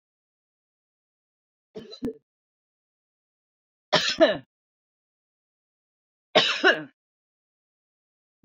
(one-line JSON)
{"three_cough_length": "8.4 s", "three_cough_amplitude": 22095, "three_cough_signal_mean_std_ratio": 0.23, "survey_phase": "beta (2021-08-13 to 2022-03-07)", "age": "45-64", "gender": "Female", "wearing_mask": "No", "symptom_none": true, "smoker_status": "Never smoked", "respiratory_condition_asthma": false, "respiratory_condition_other": false, "recruitment_source": "REACT", "submission_delay": "2 days", "covid_test_result": "Negative", "covid_test_method": "RT-qPCR"}